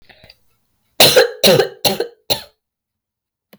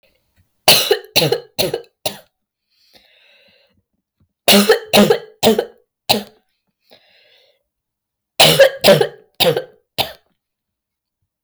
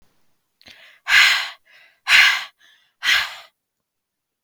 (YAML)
cough_length: 3.6 s
cough_amplitude: 32768
cough_signal_mean_std_ratio: 0.38
three_cough_length: 11.4 s
three_cough_amplitude: 32768
three_cough_signal_mean_std_ratio: 0.36
exhalation_length: 4.4 s
exhalation_amplitude: 32768
exhalation_signal_mean_std_ratio: 0.37
survey_phase: beta (2021-08-13 to 2022-03-07)
age: 18-44
gender: Female
wearing_mask: 'No'
symptom_sore_throat: true
symptom_fatigue: true
symptom_headache: true
symptom_onset: 4 days
smoker_status: Never smoked
recruitment_source: Test and Trace
submission_delay: 2 days
covid_test_result: Positive
covid_test_method: LAMP